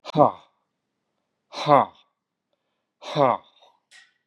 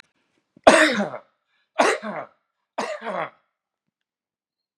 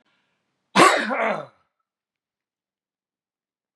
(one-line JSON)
{"exhalation_length": "4.3 s", "exhalation_amplitude": 25865, "exhalation_signal_mean_std_ratio": 0.27, "three_cough_length": "4.8 s", "three_cough_amplitude": 32768, "three_cough_signal_mean_std_ratio": 0.31, "cough_length": "3.8 s", "cough_amplitude": 32666, "cough_signal_mean_std_ratio": 0.28, "survey_phase": "beta (2021-08-13 to 2022-03-07)", "age": "65+", "gender": "Male", "wearing_mask": "No", "symptom_none": true, "smoker_status": "Ex-smoker", "respiratory_condition_asthma": false, "respiratory_condition_other": false, "recruitment_source": "REACT", "submission_delay": "2 days", "covid_test_result": "Negative", "covid_test_method": "RT-qPCR", "influenza_a_test_result": "Negative", "influenza_b_test_result": "Negative"}